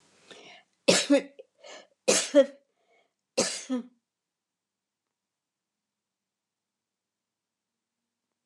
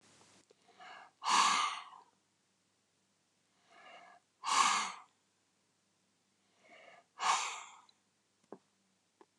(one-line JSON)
{"three_cough_length": "8.5 s", "three_cough_amplitude": 15269, "three_cough_signal_mean_std_ratio": 0.25, "exhalation_length": "9.4 s", "exhalation_amplitude": 5451, "exhalation_signal_mean_std_ratio": 0.32, "survey_phase": "alpha (2021-03-01 to 2021-08-12)", "age": "65+", "gender": "Female", "wearing_mask": "No", "symptom_none": true, "smoker_status": "Ex-smoker", "respiratory_condition_asthma": false, "respiratory_condition_other": false, "recruitment_source": "REACT", "submission_delay": "1 day", "covid_test_result": "Negative", "covid_test_method": "RT-qPCR"}